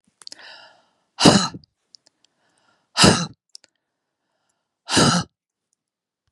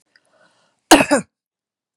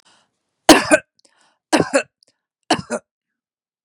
{"exhalation_length": "6.3 s", "exhalation_amplitude": 32768, "exhalation_signal_mean_std_ratio": 0.28, "cough_length": "2.0 s", "cough_amplitude": 32768, "cough_signal_mean_std_ratio": 0.26, "three_cough_length": "3.8 s", "three_cough_amplitude": 32768, "three_cough_signal_mean_std_ratio": 0.27, "survey_phase": "beta (2021-08-13 to 2022-03-07)", "age": "45-64", "gender": "Female", "wearing_mask": "No", "symptom_none": true, "smoker_status": "Never smoked", "respiratory_condition_asthma": false, "respiratory_condition_other": false, "recruitment_source": "REACT", "submission_delay": "4 days", "covid_test_result": "Negative", "covid_test_method": "RT-qPCR"}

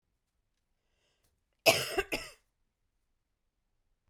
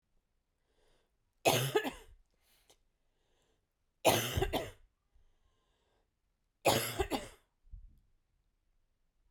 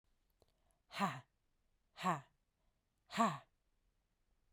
{"cough_length": "4.1 s", "cough_amplitude": 12752, "cough_signal_mean_std_ratio": 0.21, "three_cough_length": "9.3 s", "three_cough_amplitude": 7536, "three_cough_signal_mean_std_ratio": 0.3, "exhalation_length": "4.5 s", "exhalation_amplitude": 3032, "exhalation_signal_mean_std_ratio": 0.29, "survey_phase": "beta (2021-08-13 to 2022-03-07)", "age": "18-44", "gender": "Female", "wearing_mask": "No", "symptom_cough_any": true, "symptom_runny_or_blocked_nose": true, "symptom_fatigue": true, "symptom_onset": "3 days", "smoker_status": "Never smoked", "respiratory_condition_asthma": false, "respiratory_condition_other": false, "recruitment_source": "Test and Trace", "submission_delay": "1 day", "covid_test_result": "Positive", "covid_test_method": "RT-qPCR", "covid_ct_value": 22.4, "covid_ct_gene": "N gene"}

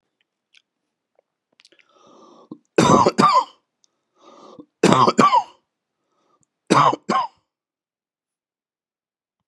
{"three_cough_length": "9.5 s", "three_cough_amplitude": 32757, "three_cough_signal_mean_std_ratio": 0.32, "survey_phase": "beta (2021-08-13 to 2022-03-07)", "age": "65+", "gender": "Male", "wearing_mask": "No", "symptom_new_continuous_cough": true, "symptom_runny_or_blocked_nose": true, "symptom_sore_throat": true, "symptom_fatigue": true, "symptom_onset": "2 days", "smoker_status": "Ex-smoker", "respiratory_condition_asthma": false, "respiratory_condition_other": false, "recruitment_source": "Test and Trace", "submission_delay": "2 days", "covid_test_result": "Positive", "covid_test_method": "RT-qPCR", "covid_ct_value": 22.1, "covid_ct_gene": "ORF1ab gene", "covid_ct_mean": 22.6, "covid_viral_load": "37000 copies/ml", "covid_viral_load_category": "Low viral load (10K-1M copies/ml)"}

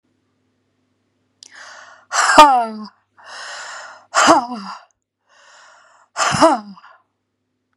{"exhalation_length": "7.8 s", "exhalation_amplitude": 32768, "exhalation_signal_mean_std_ratio": 0.34, "survey_phase": "beta (2021-08-13 to 2022-03-07)", "age": "65+", "gender": "Female", "wearing_mask": "No", "symptom_cough_any": true, "symptom_new_continuous_cough": true, "symptom_sore_throat": true, "symptom_headache": true, "symptom_onset": "2 days", "smoker_status": "Ex-smoker", "respiratory_condition_asthma": false, "respiratory_condition_other": false, "recruitment_source": "Test and Trace", "submission_delay": "1 day", "covid_test_result": "Positive", "covid_test_method": "ePCR"}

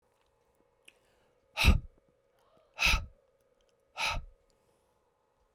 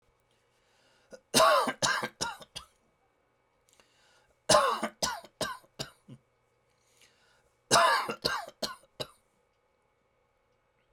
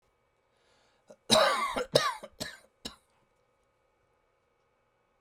{"exhalation_length": "5.5 s", "exhalation_amplitude": 9769, "exhalation_signal_mean_std_ratio": 0.27, "three_cough_length": "10.9 s", "three_cough_amplitude": 12725, "three_cough_signal_mean_std_ratio": 0.33, "cough_length": "5.2 s", "cough_amplitude": 14462, "cough_signal_mean_std_ratio": 0.3, "survey_phase": "beta (2021-08-13 to 2022-03-07)", "age": "45-64", "gender": "Male", "wearing_mask": "No", "symptom_none": true, "smoker_status": "Never smoked", "respiratory_condition_asthma": false, "respiratory_condition_other": false, "recruitment_source": "REACT", "submission_delay": "1 day", "covid_test_result": "Negative", "covid_test_method": "RT-qPCR"}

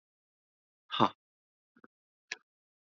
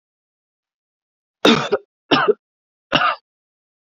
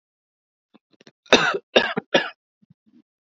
{"exhalation_length": "2.8 s", "exhalation_amplitude": 9953, "exhalation_signal_mean_std_ratio": 0.16, "three_cough_length": "3.9 s", "three_cough_amplitude": 29689, "three_cough_signal_mean_std_ratio": 0.32, "cough_length": "3.2 s", "cough_amplitude": 32768, "cough_signal_mean_std_ratio": 0.29, "survey_phase": "beta (2021-08-13 to 2022-03-07)", "age": "18-44", "gender": "Male", "wearing_mask": "No", "symptom_none": true, "smoker_status": "Never smoked", "respiratory_condition_asthma": false, "respiratory_condition_other": false, "recruitment_source": "REACT", "submission_delay": "1 day", "covid_test_result": "Negative", "covid_test_method": "RT-qPCR"}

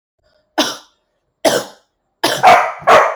{"three_cough_length": "3.2 s", "three_cough_amplitude": 32768, "three_cough_signal_mean_std_ratio": 0.45, "survey_phase": "alpha (2021-03-01 to 2021-08-12)", "age": "18-44", "gender": "Female", "wearing_mask": "Yes", "symptom_none": true, "smoker_status": "Never smoked", "respiratory_condition_asthma": false, "respiratory_condition_other": false, "recruitment_source": "REACT", "submission_delay": "1 day", "covid_test_result": "Negative", "covid_test_method": "RT-qPCR"}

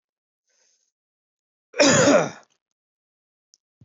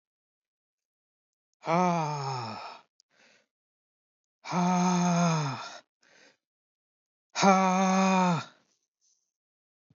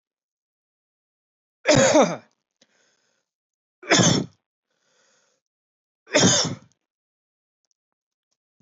{"cough_length": "3.8 s", "cough_amplitude": 19137, "cough_signal_mean_std_ratio": 0.3, "exhalation_length": "10.0 s", "exhalation_amplitude": 14867, "exhalation_signal_mean_std_ratio": 0.45, "three_cough_length": "8.6 s", "three_cough_amplitude": 19516, "three_cough_signal_mean_std_ratio": 0.3, "survey_phase": "beta (2021-08-13 to 2022-03-07)", "age": "45-64", "gender": "Male", "wearing_mask": "No", "symptom_none": true, "smoker_status": "Never smoked", "respiratory_condition_asthma": false, "respiratory_condition_other": false, "recruitment_source": "REACT", "submission_delay": "1 day", "covid_test_result": "Negative", "covid_test_method": "RT-qPCR", "influenza_a_test_result": "Negative", "influenza_b_test_result": "Negative"}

